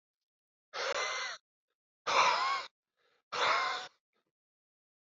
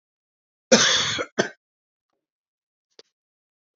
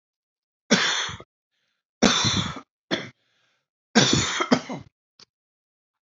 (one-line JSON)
{"exhalation_length": "5.0 s", "exhalation_amplitude": 6349, "exhalation_signal_mean_std_ratio": 0.45, "cough_length": "3.8 s", "cough_amplitude": 27980, "cough_signal_mean_std_ratio": 0.28, "three_cough_length": "6.1 s", "three_cough_amplitude": 25570, "three_cough_signal_mean_std_ratio": 0.39, "survey_phase": "beta (2021-08-13 to 2022-03-07)", "age": "18-44", "gender": "Male", "wearing_mask": "No", "symptom_none": true, "smoker_status": "Ex-smoker", "respiratory_condition_asthma": false, "respiratory_condition_other": false, "recruitment_source": "REACT", "submission_delay": "12 days", "covid_test_result": "Negative", "covid_test_method": "RT-qPCR"}